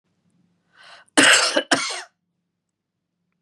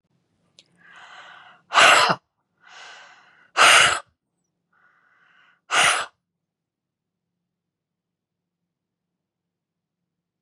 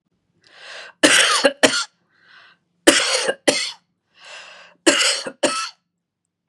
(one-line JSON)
{"cough_length": "3.4 s", "cough_amplitude": 31527, "cough_signal_mean_std_ratio": 0.33, "exhalation_length": "10.4 s", "exhalation_amplitude": 30291, "exhalation_signal_mean_std_ratio": 0.26, "three_cough_length": "6.5 s", "three_cough_amplitude": 32768, "three_cough_signal_mean_std_ratio": 0.42, "survey_phase": "beta (2021-08-13 to 2022-03-07)", "age": "45-64", "gender": "Female", "wearing_mask": "No", "symptom_none": true, "smoker_status": "Never smoked", "respiratory_condition_asthma": false, "respiratory_condition_other": false, "recruitment_source": "REACT", "submission_delay": "1 day", "covid_test_result": "Negative", "covid_test_method": "RT-qPCR", "influenza_a_test_result": "Negative", "influenza_b_test_result": "Negative"}